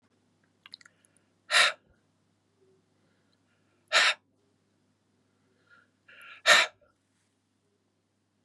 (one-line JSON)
{"exhalation_length": "8.4 s", "exhalation_amplitude": 17654, "exhalation_signal_mean_std_ratio": 0.22, "survey_phase": "beta (2021-08-13 to 2022-03-07)", "age": "45-64", "gender": "Male", "wearing_mask": "No", "symptom_cough_any": true, "symptom_onset": "10 days", "smoker_status": "Never smoked", "respiratory_condition_asthma": false, "respiratory_condition_other": false, "recruitment_source": "Test and Trace", "submission_delay": "2 days", "covid_test_result": "Positive", "covid_test_method": "RT-qPCR", "covid_ct_value": 19.9, "covid_ct_gene": "ORF1ab gene", "covid_ct_mean": 20.7, "covid_viral_load": "160000 copies/ml", "covid_viral_load_category": "Low viral load (10K-1M copies/ml)"}